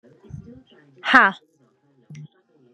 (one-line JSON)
{"exhalation_length": "2.7 s", "exhalation_amplitude": 32767, "exhalation_signal_mean_std_ratio": 0.24, "survey_phase": "beta (2021-08-13 to 2022-03-07)", "age": "18-44", "gender": "Female", "wearing_mask": "No", "symptom_cough_any": true, "symptom_shortness_of_breath": true, "symptom_fatigue": true, "symptom_change_to_sense_of_smell_or_taste": true, "symptom_onset": "13 days", "smoker_status": "Ex-smoker", "respiratory_condition_asthma": false, "respiratory_condition_other": false, "recruitment_source": "REACT", "submission_delay": "0 days", "covid_test_result": "Negative", "covid_test_method": "RT-qPCR"}